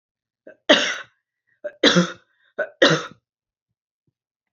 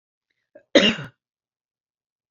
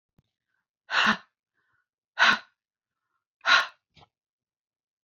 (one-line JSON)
{"three_cough_length": "4.5 s", "three_cough_amplitude": 28820, "three_cough_signal_mean_std_ratio": 0.31, "cough_length": "2.3 s", "cough_amplitude": 27465, "cough_signal_mean_std_ratio": 0.23, "exhalation_length": "5.0 s", "exhalation_amplitude": 14940, "exhalation_signal_mean_std_ratio": 0.27, "survey_phase": "beta (2021-08-13 to 2022-03-07)", "age": "65+", "gender": "Female", "wearing_mask": "No", "symptom_none": true, "smoker_status": "Never smoked", "respiratory_condition_asthma": false, "respiratory_condition_other": false, "recruitment_source": "REACT", "submission_delay": "2 days", "covid_test_result": "Negative", "covid_test_method": "RT-qPCR", "influenza_a_test_result": "Negative", "influenza_b_test_result": "Negative"}